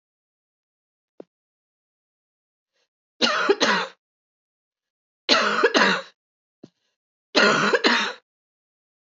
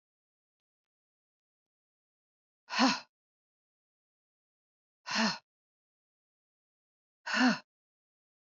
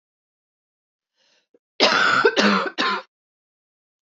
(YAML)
three_cough_length: 9.1 s
three_cough_amplitude: 23777
three_cough_signal_mean_std_ratio: 0.37
exhalation_length: 8.4 s
exhalation_amplitude: 7938
exhalation_signal_mean_std_ratio: 0.23
cough_length: 4.1 s
cough_amplitude: 24201
cough_signal_mean_std_ratio: 0.41
survey_phase: beta (2021-08-13 to 2022-03-07)
age: 45-64
gender: Female
wearing_mask: 'No'
symptom_cough_any: true
symptom_runny_or_blocked_nose: true
symptom_fatigue: true
symptom_other: true
symptom_onset: 4 days
smoker_status: Never smoked
respiratory_condition_asthma: false
respiratory_condition_other: false
recruitment_source: REACT
submission_delay: 1 day
covid_test_result: Positive
covid_test_method: RT-qPCR
covid_ct_value: 15.0
covid_ct_gene: E gene
influenza_a_test_result: Negative
influenza_b_test_result: Negative